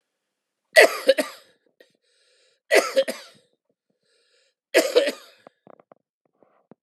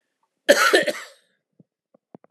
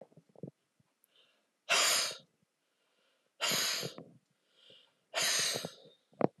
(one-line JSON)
{"three_cough_length": "6.8 s", "three_cough_amplitude": 31709, "three_cough_signal_mean_std_ratio": 0.27, "cough_length": "2.3 s", "cough_amplitude": 32768, "cough_signal_mean_std_ratio": 0.33, "exhalation_length": "6.4 s", "exhalation_amplitude": 10230, "exhalation_signal_mean_std_ratio": 0.4, "survey_phase": "beta (2021-08-13 to 2022-03-07)", "age": "65+", "gender": "Male", "wearing_mask": "No", "symptom_none": true, "smoker_status": "Never smoked", "respiratory_condition_asthma": true, "respiratory_condition_other": false, "recruitment_source": "REACT", "submission_delay": "2 days", "covid_test_result": "Negative", "covid_test_method": "RT-qPCR"}